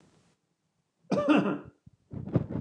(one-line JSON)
{"cough_length": "2.6 s", "cough_amplitude": 8080, "cough_signal_mean_std_ratio": 0.43, "survey_phase": "beta (2021-08-13 to 2022-03-07)", "age": "65+", "gender": "Male", "wearing_mask": "No", "symptom_none": true, "smoker_status": "Never smoked", "respiratory_condition_asthma": false, "respiratory_condition_other": false, "recruitment_source": "REACT", "submission_delay": "2 days", "covid_test_result": "Negative", "covid_test_method": "RT-qPCR", "influenza_a_test_result": "Negative", "influenza_b_test_result": "Negative"}